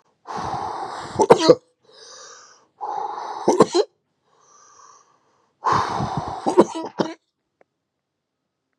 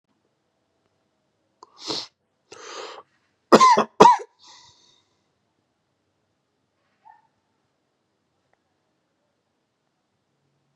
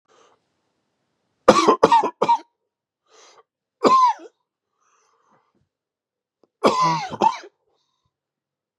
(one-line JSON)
{"exhalation_length": "8.8 s", "exhalation_amplitude": 32768, "exhalation_signal_mean_std_ratio": 0.36, "cough_length": "10.8 s", "cough_amplitude": 32768, "cough_signal_mean_std_ratio": 0.18, "three_cough_length": "8.8 s", "three_cough_amplitude": 32767, "three_cough_signal_mean_std_ratio": 0.32, "survey_phase": "beta (2021-08-13 to 2022-03-07)", "age": "18-44", "gender": "Male", "wearing_mask": "No", "symptom_cough_any": true, "symptom_runny_or_blocked_nose": true, "symptom_shortness_of_breath": true, "symptom_sore_throat": true, "symptom_diarrhoea": true, "symptom_fever_high_temperature": true, "symptom_headache": true, "symptom_onset": "2 days", "smoker_status": "Never smoked", "respiratory_condition_asthma": false, "respiratory_condition_other": false, "recruitment_source": "Test and Trace", "submission_delay": "2 days", "covid_test_result": "Positive", "covid_test_method": "RT-qPCR"}